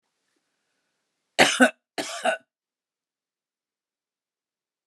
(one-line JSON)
{"cough_length": "4.9 s", "cough_amplitude": 28046, "cough_signal_mean_std_ratio": 0.22, "survey_phase": "alpha (2021-03-01 to 2021-08-12)", "age": "45-64", "gender": "Female", "wearing_mask": "No", "symptom_none": true, "smoker_status": "Never smoked", "respiratory_condition_asthma": false, "respiratory_condition_other": false, "recruitment_source": "REACT", "submission_delay": "2 days", "covid_test_result": "Negative", "covid_test_method": "RT-qPCR"}